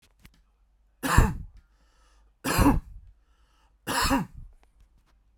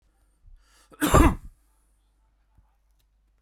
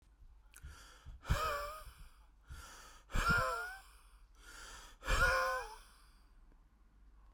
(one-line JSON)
{"three_cough_length": "5.4 s", "three_cough_amplitude": 25455, "three_cough_signal_mean_std_ratio": 0.35, "cough_length": "3.4 s", "cough_amplitude": 23030, "cough_signal_mean_std_ratio": 0.24, "exhalation_length": "7.3 s", "exhalation_amplitude": 3846, "exhalation_signal_mean_std_ratio": 0.47, "survey_phase": "beta (2021-08-13 to 2022-03-07)", "age": "18-44", "gender": "Male", "wearing_mask": "No", "symptom_none": true, "smoker_status": "Ex-smoker", "respiratory_condition_asthma": false, "respiratory_condition_other": false, "recruitment_source": "Test and Trace", "submission_delay": "19 days", "covid_test_result": "Negative", "covid_test_method": "RT-qPCR"}